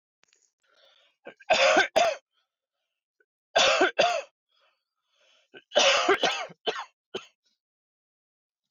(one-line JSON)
{"three_cough_length": "8.7 s", "three_cough_amplitude": 12775, "three_cough_signal_mean_std_ratio": 0.38, "survey_phase": "beta (2021-08-13 to 2022-03-07)", "age": "18-44", "gender": "Male", "wearing_mask": "No", "symptom_cough_any": true, "smoker_status": "Current smoker (e-cigarettes or vapes only)", "respiratory_condition_asthma": false, "respiratory_condition_other": false, "recruitment_source": "REACT", "submission_delay": "3 days", "covid_test_result": "Negative", "covid_test_method": "RT-qPCR", "influenza_a_test_result": "Unknown/Void", "influenza_b_test_result": "Unknown/Void"}